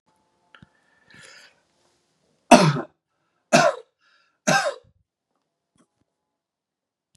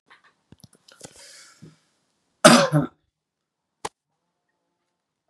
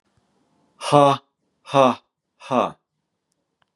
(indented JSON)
{
  "three_cough_length": "7.2 s",
  "three_cough_amplitude": 32767,
  "three_cough_signal_mean_std_ratio": 0.23,
  "cough_length": "5.3 s",
  "cough_amplitude": 32768,
  "cough_signal_mean_std_ratio": 0.2,
  "exhalation_length": "3.8 s",
  "exhalation_amplitude": 30922,
  "exhalation_signal_mean_std_ratio": 0.3,
  "survey_phase": "beta (2021-08-13 to 2022-03-07)",
  "age": "18-44",
  "gender": "Male",
  "wearing_mask": "No",
  "symptom_sore_throat": true,
  "smoker_status": "Never smoked",
  "respiratory_condition_asthma": false,
  "respiratory_condition_other": false,
  "recruitment_source": "Test and Trace",
  "submission_delay": "1 day",
  "covid_test_result": "Negative",
  "covid_test_method": "RT-qPCR"
}